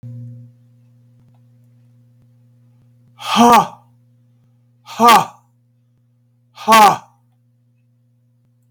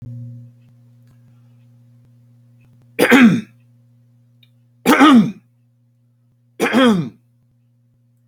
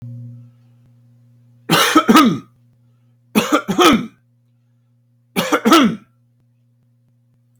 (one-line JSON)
{"exhalation_length": "8.7 s", "exhalation_amplitude": 32768, "exhalation_signal_mean_std_ratio": 0.28, "three_cough_length": "8.3 s", "three_cough_amplitude": 32768, "three_cough_signal_mean_std_ratio": 0.34, "cough_length": "7.6 s", "cough_amplitude": 32768, "cough_signal_mean_std_ratio": 0.39, "survey_phase": "beta (2021-08-13 to 2022-03-07)", "age": "65+", "gender": "Male", "wearing_mask": "No", "symptom_none": true, "smoker_status": "Ex-smoker", "respiratory_condition_asthma": false, "respiratory_condition_other": false, "recruitment_source": "REACT", "submission_delay": "2 days", "covid_test_result": "Negative", "covid_test_method": "RT-qPCR", "influenza_a_test_result": "Negative", "influenza_b_test_result": "Negative"}